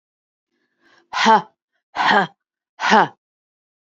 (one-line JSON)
{"exhalation_length": "3.9 s", "exhalation_amplitude": 27161, "exhalation_signal_mean_std_ratio": 0.35, "survey_phase": "beta (2021-08-13 to 2022-03-07)", "age": "45-64", "gender": "Female", "wearing_mask": "No", "symptom_cough_any": true, "symptom_runny_or_blocked_nose": true, "symptom_sore_throat": true, "symptom_fatigue": true, "symptom_onset": "26 days", "smoker_status": "Current smoker (e-cigarettes or vapes only)", "respiratory_condition_asthma": false, "respiratory_condition_other": false, "recruitment_source": "Test and Trace", "submission_delay": "2 days", "covid_test_result": "Negative", "covid_test_method": "RT-qPCR"}